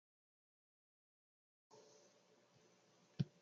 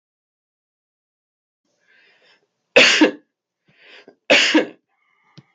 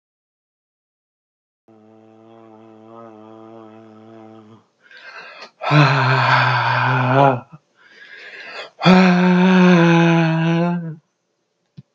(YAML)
cough_length: 3.4 s
cough_amplitude: 1469
cough_signal_mean_std_ratio: 0.14
three_cough_length: 5.5 s
three_cough_amplitude: 32768
three_cough_signal_mean_std_ratio: 0.28
exhalation_length: 11.9 s
exhalation_amplitude: 32766
exhalation_signal_mean_std_ratio: 0.52
survey_phase: beta (2021-08-13 to 2022-03-07)
age: 45-64
gender: Male
wearing_mask: 'No'
symptom_none: true
smoker_status: Never smoked
respiratory_condition_asthma: false
respiratory_condition_other: false
recruitment_source: REACT
submission_delay: 1 day
covid_test_result: Negative
covid_test_method: RT-qPCR
influenza_a_test_result: Negative
influenza_b_test_result: Negative